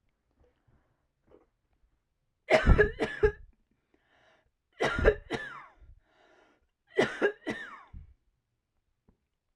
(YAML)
three_cough_length: 9.6 s
three_cough_amplitude: 12923
three_cough_signal_mean_std_ratio: 0.29
survey_phase: alpha (2021-03-01 to 2021-08-12)
age: 18-44
gender: Female
wearing_mask: 'No'
symptom_fatigue: true
symptom_headache: true
symptom_onset: 13 days
smoker_status: Never smoked
respiratory_condition_asthma: true
respiratory_condition_other: false
recruitment_source: REACT
submission_delay: 1 day
covid_test_result: Negative
covid_test_method: RT-qPCR